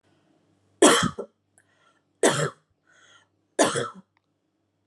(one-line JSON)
{"three_cough_length": "4.9 s", "three_cough_amplitude": 25425, "three_cough_signal_mean_std_ratio": 0.3, "survey_phase": "alpha (2021-03-01 to 2021-08-12)", "age": "18-44", "gender": "Female", "wearing_mask": "No", "symptom_none": true, "smoker_status": "Ex-smoker", "respiratory_condition_asthma": false, "respiratory_condition_other": false, "recruitment_source": "REACT", "submission_delay": "3 days", "covid_test_result": "Negative", "covid_test_method": "RT-qPCR"}